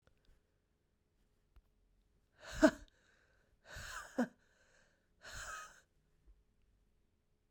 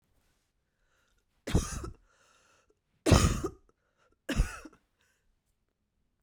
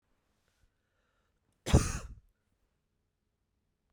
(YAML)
exhalation_length: 7.5 s
exhalation_amplitude: 6092
exhalation_signal_mean_std_ratio: 0.2
three_cough_length: 6.2 s
three_cough_amplitude: 11651
three_cough_signal_mean_std_ratio: 0.27
cough_length: 3.9 s
cough_amplitude: 10878
cough_signal_mean_std_ratio: 0.18
survey_phase: beta (2021-08-13 to 2022-03-07)
age: 18-44
gender: Female
wearing_mask: 'No'
symptom_cough_any: true
symptom_runny_or_blocked_nose: true
symptom_sore_throat: true
symptom_abdominal_pain: true
symptom_fatigue: true
symptom_fever_high_temperature: true
symptom_headache: true
symptom_onset: 3 days
smoker_status: Never smoked
respiratory_condition_asthma: false
respiratory_condition_other: false
recruitment_source: Test and Trace
submission_delay: 1 day
covid_test_result: Positive
covid_test_method: RT-qPCR